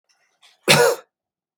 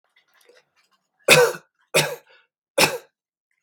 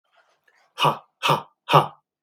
cough_length: 1.6 s
cough_amplitude: 32672
cough_signal_mean_std_ratio: 0.34
three_cough_length: 3.6 s
three_cough_amplitude: 32768
three_cough_signal_mean_std_ratio: 0.3
exhalation_length: 2.2 s
exhalation_amplitude: 32489
exhalation_signal_mean_std_ratio: 0.35
survey_phase: beta (2021-08-13 to 2022-03-07)
age: 45-64
gender: Male
wearing_mask: 'No'
symptom_none: true
smoker_status: Never smoked
respiratory_condition_asthma: false
respiratory_condition_other: false
recruitment_source: REACT
submission_delay: 2 days
covid_test_result: Negative
covid_test_method: RT-qPCR
influenza_a_test_result: Negative
influenza_b_test_result: Negative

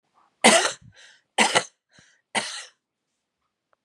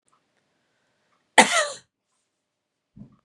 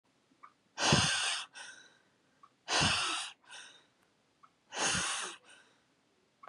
three_cough_length: 3.8 s
three_cough_amplitude: 29881
three_cough_signal_mean_std_ratio: 0.3
cough_length: 3.2 s
cough_amplitude: 32767
cough_signal_mean_std_ratio: 0.2
exhalation_length: 6.5 s
exhalation_amplitude: 9642
exhalation_signal_mean_std_ratio: 0.45
survey_phase: beta (2021-08-13 to 2022-03-07)
age: 45-64
gender: Female
wearing_mask: 'No'
symptom_cough_any: true
symptom_new_continuous_cough: true
symptom_runny_or_blocked_nose: true
symptom_sore_throat: true
symptom_headache: true
smoker_status: Ex-smoker
respiratory_condition_asthma: false
respiratory_condition_other: false
recruitment_source: Test and Trace
submission_delay: 2 days
covid_test_result: Positive
covid_test_method: RT-qPCR
covid_ct_value: 26.7
covid_ct_gene: ORF1ab gene
covid_ct_mean: 27.3
covid_viral_load: 1100 copies/ml
covid_viral_load_category: Minimal viral load (< 10K copies/ml)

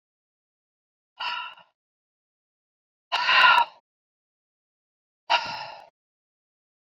exhalation_length: 7.0 s
exhalation_amplitude: 19164
exhalation_signal_mean_std_ratio: 0.27
survey_phase: beta (2021-08-13 to 2022-03-07)
age: 45-64
gender: Female
wearing_mask: 'No'
symptom_cough_any: true
smoker_status: Ex-smoker
respiratory_condition_asthma: false
respiratory_condition_other: false
recruitment_source: REACT
submission_delay: 2 days
covid_test_result: Negative
covid_test_method: RT-qPCR
influenza_a_test_result: Negative
influenza_b_test_result: Negative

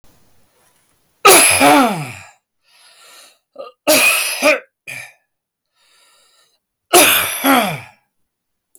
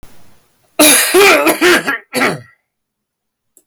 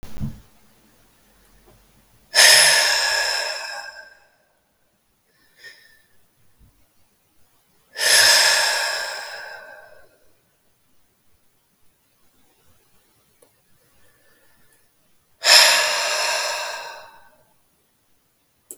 three_cough_length: 8.8 s
three_cough_amplitude: 32768
three_cough_signal_mean_std_ratio: 0.42
cough_length: 3.7 s
cough_amplitude: 32768
cough_signal_mean_std_ratio: 0.55
exhalation_length: 18.8 s
exhalation_amplitude: 32768
exhalation_signal_mean_std_ratio: 0.36
survey_phase: beta (2021-08-13 to 2022-03-07)
age: 45-64
gender: Male
wearing_mask: 'No'
symptom_headache: true
smoker_status: Ex-smoker
respiratory_condition_asthma: false
respiratory_condition_other: false
recruitment_source: REACT
submission_delay: 7 days
covid_test_result: Negative
covid_test_method: RT-qPCR
influenza_a_test_result: Negative
influenza_b_test_result: Negative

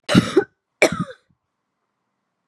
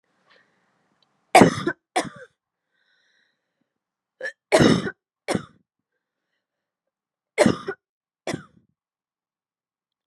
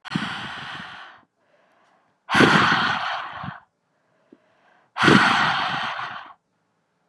cough_length: 2.5 s
cough_amplitude: 32720
cough_signal_mean_std_ratio: 0.3
three_cough_length: 10.1 s
three_cough_amplitude: 32623
three_cough_signal_mean_std_ratio: 0.23
exhalation_length: 7.1 s
exhalation_amplitude: 30241
exhalation_signal_mean_std_ratio: 0.46
survey_phase: beta (2021-08-13 to 2022-03-07)
age: 18-44
gender: Female
wearing_mask: 'No'
symptom_cough_any: true
symptom_runny_or_blocked_nose: true
symptom_headache: true
smoker_status: Prefer not to say
respiratory_condition_asthma: false
respiratory_condition_other: false
recruitment_source: Test and Trace
submission_delay: 2 days
covid_test_result: Positive
covid_test_method: RT-qPCR
covid_ct_value: 25.6
covid_ct_gene: N gene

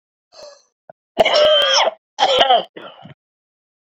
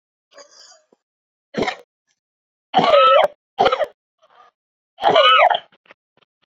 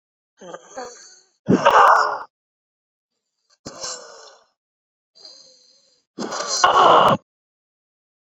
cough_length: 3.8 s
cough_amplitude: 28380
cough_signal_mean_std_ratio: 0.49
three_cough_length: 6.5 s
three_cough_amplitude: 28910
three_cough_signal_mean_std_ratio: 0.39
exhalation_length: 8.4 s
exhalation_amplitude: 27450
exhalation_signal_mean_std_ratio: 0.35
survey_phase: beta (2021-08-13 to 2022-03-07)
age: 18-44
gender: Male
wearing_mask: 'No'
symptom_cough_any: true
symptom_shortness_of_breath: true
symptom_sore_throat: true
symptom_diarrhoea: true
symptom_fatigue: true
symptom_change_to_sense_of_smell_or_taste: true
smoker_status: Ex-smoker
respiratory_condition_asthma: false
respiratory_condition_other: false
recruitment_source: Test and Trace
submission_delay: -1 day
covid_test_result: Negative
covid_test_method: LFT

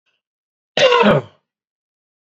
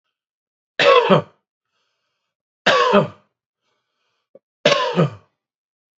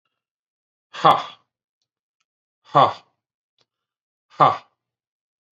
cough_length: 2.2 s
cough_amplitude: 28773
cough_signal_mean_std_ratio: 0.37
three_cough_length: 6.0 s
three_cough_amplitude: 28813
three_cough_signal_mean_std_ratio: 0.36
exhalation_length: 5.5 s
exhalation_amplitude: 28500
exhalation_signal_mean_std_ratio: 0.22
survey_phase: beta (2021-08-13 to 2022-03-07)
age: 45-64
gender: Male
wearing_mask: 'No'
symptom_none: true
smoker_status: Never smoked
respiratory_condition_asthma: false
respiratory_condition_other: false
recruitment_source: REACT
submission_delay: 5 days
covid_test_result: Negative
covid_test_method: RT-qPCR
influenza_a_test_result: Negative
influenza_b_test_result: Negative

